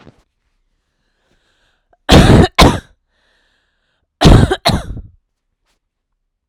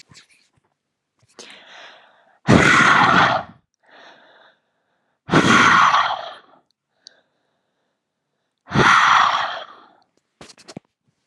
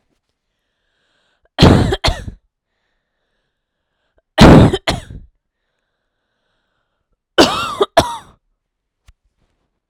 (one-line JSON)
{"cough_length": "6.5 s", "cough_amplitude": 32768, "cough_signal_mean_std_ratio": 0.33, "exhalation_length": "11.3 s", "exhalation_amplitude": 32767, "exhalation_signal_mean_std_ratio": 0.41, "three_cough_length": "9.9 s", "three_cough_amplitude": 32768, "three_cough_signal_mean_std_ratio": 0.28, "survey_phase": "alpha (2021-03-01 to 2021-08-12)", "age": "18-44", "gender": "Female", "wearing_mask": "No", "symptom_none": true, "smoker_status": "Never smoked", "respiratory_condition_asthma": true, "respiratory_condition_other": false, "recruitment_source": "REACT", "submission_delay": "2 days", "covid_test_result": "Negative", "covid_test_method": "RT-qPCR"}